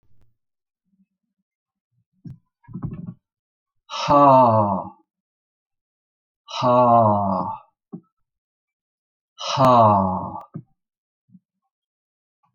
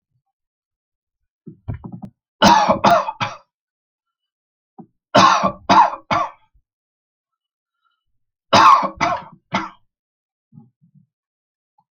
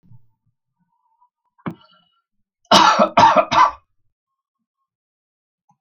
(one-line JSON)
{"exhalation_length": "12.5 s", "exhalation_amplitude": 26484, "exhalation_signal_mean_std_ratio": 0.38, "three_cough_length": "11.9 s", "three_cough_amplitude": 32546, "three_cough_signal_mean_std_ratio": 0.33, "cough_length": "5.8 s", "cough_amplitude": 31290, "cough_signal_mean_std_ratio": 0.31, "survey_phase": "alpha (2021-03-01 to 2021-08-12)", "age": "65+", "gender": "Male", "wearing_mask": "No", "symptom_none": true, "smoker_status": "Never smoked", "respiratory_condition_asthma": false, "respiratory_condition_other": false, "recruitment_source": "REACT", "submission_delay": "2 days", "covid_test_result": "Negative", "covid_test_method": "RT-qPCR"}